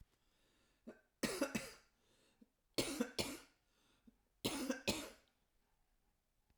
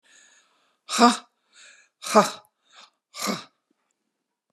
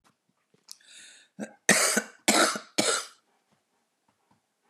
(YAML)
three_cough_length: 6.6 s
three_cough_amplitude: 2345
three_cough_signal_mean_std_ratio: 0.37
exhalation_length: 4.5 s
exhalation_amplitude: 30062
exhalation_signal_mean_std_ratio: 0.25
cough_length: 4.7 s
cough_amplitude: 21011
cough_signal_mean_std_ratio: 0.35
survey_phase: alpha (2021-03-01 to 2021-08-12)
age: 65+
gender: Female
wearing_mask: 'No'
symptom_none: true
smoker_status: Ex-smoker
respiratory_condition_asthma: false
respiratory_condition_other: false
recruitment_source: REACT
submission_delay: 1 day
covid_test_result: Negative
covid_test_method: RT-qPCR